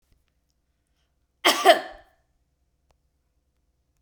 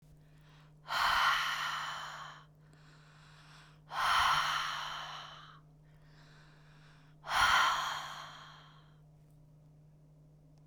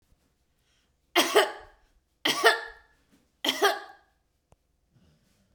{"cough_length": "4.0 s", "cough_amplitude": 30223, "cough_signal_mean_std_ratio": 0.2, "exhalation_length": "10.7 s", "exhalation_amplitude": 5200, "exhalation_signal_mean_std_ratio": 0.5, "three_cough_length": "5.5 s", "three_cough_amplitude": 21115, "three_cough_signal_mean_std_ratio": 0.31, "survey_phase": "beta (2021-08-13 to 2022-03-07)", "age": "45-64", "gender": "Female", "wearing_mask": "No", "symptom_none": true, "symptom_onset": "6 days", "smoker_status": "Ex-smoker", "respiratory_condition_asthma": false, "respiratory_condition_other": false, "recruitment_source": "REACT", "submission_delay": "1 day", "covid_test_result": "Negative", "covid_test_method": "RT-qPCR"}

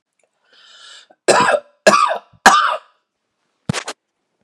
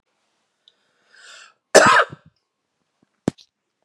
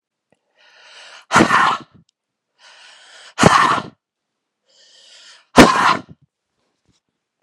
{"three_cough_length": "4.4 s", "three_cough_amplitude": 32768, "three_cough_signal_mean_std_ratio": 0.37, "cough_length": "3.8 s", "cough_amplitude": 32768, "cough_signal_mean_std_ratio": 0.23, "exhalation_length": "7.4 s", "exhalation_amplitude": 32768, "exhalation_signal_mean_std_ratio": 0.32, "survey_phase": "beta (2021-08-13 to 2022-03-07)", "age": "18-44", "gender": "Male", "wearing_mask": "No", "symptom_runny_or_blocked_nose": true, "smoker_status": "Never smoked", "respiratory_condition_asthma": false, "respiratory_condition_other": false, "recruitment_source": "Test and Trace", "submission_delay": "1 day", "covid_test_result": "Positive", "covid_test_method": "RT-qPCR", "covid_ct_value": 22.9, "covid_ct_gene": "N gene"}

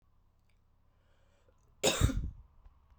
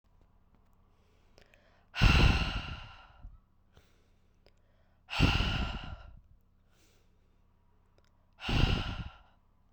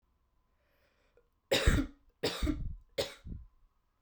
{"cough_length": "3.0 s", "cough_amplitude": 7688, "cough_signal_mean_std_ratio": 0.31, "exhalation_length": "9.7 s", "exhalation_amplitude": 9881, "exhalation_signal_mean_std_ratio": 0.35, "three_cough_length": "4.0 s", "three_cough_amplitude": 6387, "three_cough_signal_mean_std_ratio": 0.38, "survey_phase": "beta (2021-08-13 to 2022-03-07)", "age": "18-44", "gender": "Female", "wearing_mask": "No", "symptom_runny_or_blocked_nose": true, "symptom_fatigue": true, "symptom_headache": true, "symptom_change_to_sense_of_smell_or_taste": true, "symptom_loss_of_taste": true, "smoker_status": "Never smoked", "respiratory_condition_asthma": false, "respiratory_condition_other": false, "recruitment_source": "Test and Trace", "submission_delay": "2 days", "covid_test_result": "Positive", "covid_test_method": "RT-qPCR", "covid_ct_value": 14.5, "covid_ct_gene": "ORF1ab gene", "covid_ct_mean": 14.7, "covid_viral_load": "15000000 copies/ml", "covid_viral_load_category": "High viral load (>1M copies/ml)"}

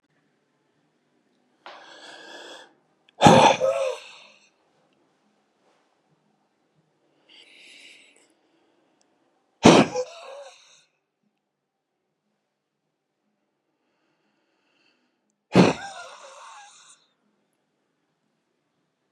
{"exhalation_length": "19.1 s", "exhalation_amplitude": 32748, "exhalation_signal_mean_std_ratio": 0.2, "survey_phase": "beta (2021-08-13 to 2022-03-07)", "age": "45-64", "gender": "Male", "wearing_mask": "No", "symptom_none": true, "smoker_status": "Never smoked", "respiratory_condition_asthma": false, "respiratory_condition_other": false, "recruitment_source": "REACT", "submission_delay": "32 days", "covid_test_result": "Negative", "covid_test_method": "RT-qPCR", "influenza_a_test_result": "Unknown/Void", "influenza_b_test_result": "Unknown/Void"}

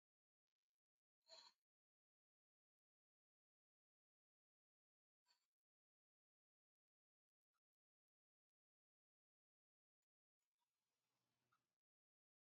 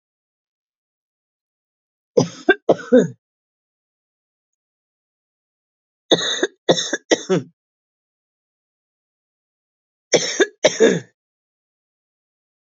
{"exhalation_length": "12.5 s", "exhalation_amplitude": 73, "exhalation_signal_mean_std_ratio": 0.12, "three_cough_length": "12.8 s", "three_cough_amplitude": 29780, "three_cough_signal_mean_std_ratio": 0.26, "survey_phase": "beta (2021-08-13 to 2022-03-07)", "age": "45-64", "gender": "Female", "wearing_mask": "Yes", "symptom_cough_any": true, "symptom_runny_or_blocked_nose": true, "symptom_fatigue": true, "symptom_fever_high_temperature": true, "symptom_change_to_sense_of_smell_or_taste": true, "symptom_onset": "3 days", "smoker_status": "Never smoked", "respiratory_condition_asthma": false, "respiratory_condition_other": false, "recruitment_source": "Test and Trace", "submission_delay": "2 days", "covid_test_result": "Positive", "covid_test_method": "RT-qPCR", "covid_ct_value": 16.8, "covid_ct_gene": "ORF1ab gene", "covid_ct_mean": 17.3, "covid_viral_load": "2100000 copies/ml", "covid_viral_load_category": "High viral load (>1M copies/ml)"}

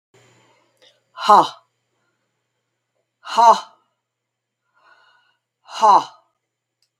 {"exhalation_length": "7.0 s", "exhalation_amplitude": 32768, "exhalation_signal_mean_std_ratio": 0.25, "survey_phase": "beta (2021-08-13 to 2022-03-07)", "age": "65+", "gender": "Female", "wearing_mask": "No", "symptom_cough_any": true, "symptom_runny_or_blocked_nose": true, "symptom_sore_throat": true, "symptom_onset": "2 days", "smoker_status": "Ex-smoker", "respiratory_condition_asthma": false, "respiratory_condition_other": false, "recruitment_source": "Test and Trace", "submission_delay": "1 day", "covid_test_result": "Positive", "covid_test_method": "RT-qPCR", "covid_ct_value": 17.9, "covid_ct_gene": "N gene"}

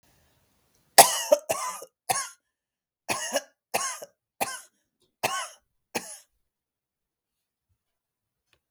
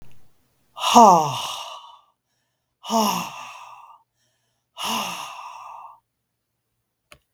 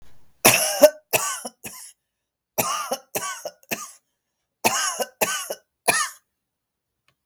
{"cough_length": "8.7 s", "cough_amplitude": 32768, "cough_signal_mean_std_ratio": 0.24, "exhalation_length": "7.3 s", "exhalation_amplitude": 32768, "exhalation_signal_mean_std_ratio": 0.32, "three_cough_length": "7.3 s", "three_cough_amplitude": 32768, "three_cough_signal_mean_std_ratio": 0.38, "survey_phase": "beta (2021-08-13 to 2022-03-07)", "age": "65+", "gender": "Female", "wearing_mask": "No", "symptom_cough_any": true, "symptom_abdominal_pain": true, "symptom_other": true, "symptom_onset": "10 days", "smoker_status": "Never smoked", "respiratory_condition_asthma": false, "respiratory_condition_other": false, "recruitment_source": "REACT", "submission_delay": "2 days", "covid_test_result": "Negative", "covid_test_method": "RT-qPCR", "influenza_a_test_result": "Negative", "influenza_b_test_result": "Negative"}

